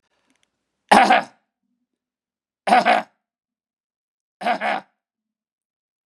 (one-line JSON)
{"three_cough_length": "6.1 s", "three_cough_amplitude": 32767, "three_cough_signal_mean_std_ratio": 0.28, "survey_phase": "beta (2021-08-13 to 2022-03-07)", "age": "65+", "gender": "Male", "wearing_mask": "No", "symptom_none": true, "smoker_status": "Ex-smoker", "respiratory_condition_asthma": false, "respiratory_condition_other": false, "recruitment_source": "REACT", "submission_delay": "3 days", "covid_test_result": "Negative", "covid_test_method": "RT-qPCR", "influenza_a_test_result": "Negative", "influenza_b_test_result": "Negative"}